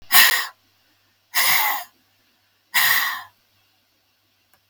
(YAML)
exhalation_length: 4.7 s
exhalation_amplitude: 32767
exhalation_signal_mean_std_ratio: 0.4
survey_phase: alpha (2021-03-01 to 2021-08-12)
age: 65+
gender: Female
wearing_mask: 'No'
symptom_none: true
smoker_status: Ex-smoker
respiratory_condition_asthma: true
respiratory_condition_other: false
recruitment_source: REACT
submission_delay: 1 day
covid_test_result: Negative
covid_test_method: RT-qPCR